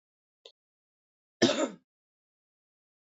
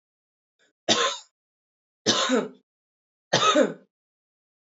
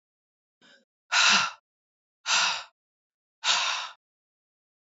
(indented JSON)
{
  "cough_length": "3.2 s",
  "cough_amplitude": 14085,
  "cough_signal_mean_std_ratio": 0.21,
  "three_cough_length": "4.8 s",
  "three_cough_amplitude": 17766,
  "three_cough_signal_mean_std_ratio": 0.37,
  "exhalation_length": "4.9 s",
  "exhalation_amplitude": 14002,
  "exhalation_signal_mean_std_ratio": 0.38,
  "survey_phase": "alpha (2021-03-01 to 2021-08-12)",
  "age": "18-44",
  "gender": "Female",
  "wearing_mask": "No",
  "symptom_headache": true,
  "smoker_status": "Never smoked",
  "respiratory_condition_asthma": false,
  "respiratory_condition_other": false,
  "recruitment_source": "Test and Trace",
  "submission_delay": "1 day",
  "covid_test_result": "Positive",
  "covid_test_method": "RT-qPCR"
}